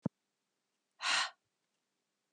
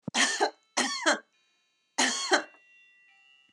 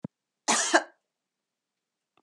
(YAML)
exhalation_length: 2.3 s
exhalation_amplitude: 3451
exhalation_signal_mean_std_ratio: 0.28
three_cough_length: 3.5 s
three_cough_amplitude: 16138
three_cough_signal_mean_std_ratio: 0.45
cough_length: 2.2 s
cough_amplitude: 17259
cough_signal_mean_std_ratio: 0.28
survey_phase: beta (2021-08-13 to 2022-03-07)
age: 65+
gender: Female
wearing_mask: 'Yes'
symptom_none: true
smoker_status: Ex-smoker
respiratory_condition_asthma: false
respiratory_condition_other: false
recruitment_source: REACT
submission_delay: 5 days
covid_test_result: Negative
covid_test_method: RT-qPCR
influenza_a_test_result: Negative
influenza_b_test_result: Negative